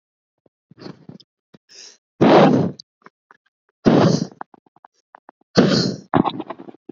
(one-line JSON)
{"exhalation_length": "6.9 s", "exhalation_amplitude": 27861, "exhalation_signal_mean_std_ratio": 0.37, "survey_phase": "beta (2021-08-13 to 2022-03-07)", "age": "18-44", "gender": "Female", "wearing_mask": "No", "symptom_cough_any": true, "smoker_status": "Never smoked", "respiratory_condition_asthma": false, "respiratory_condition_other": false, "recruitment_source": "REACT", "submission_delay": "1 day", "covid_test_result": "Negative", "covid_test_method": "RT-qPCR", "influenza_a_test_result": "Negative", "influenza_b_test_result": "Negative"}